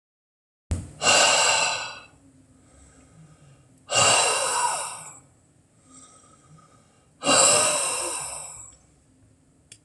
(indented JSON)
{
  "exhalation_length": "9.8 s",
  "exhalation_amplitude": 21403,
  "exhalation_signal_mean_std_ratio": 0.47,
  "survey_phase": "beta (2021-08-13 to 2022-03-07)",
  "age": "65+",
  "gender": "Male",
  "wearing_mask": "No",
  "symptom_none": true,
  "smoker_status": "Never smoked",
  "respiratory_condition_asthma": false,
  "respiratory_condition_other": false,
  "recruitment_source": "REACT",
  "submission_delay": "1 day",
  "covid_test_result": "Negative",
  "covid_test_method": "RT-qPCR"
}